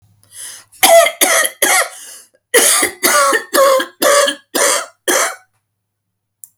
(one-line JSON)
{"cough_length": "6.6 s", "cough_amplitude": 32768, "cough_signal_mean_std_ratio": 0.57, "survey_phase": "alpha (2021-03-01 to 2021-08-12)", "age": "65+", "gender": "Female", "wearing_mask": "No", "symptom_none": true, "smoker_status": "Ex-smoker", "respiratory_condition_asthma": false, "respiratory_condition_other": false, "recruitment_source": "REACT", "submission_delay": "1 day", "covid_test_result": "Negative", "covid_test_method": "RT-qPCR"}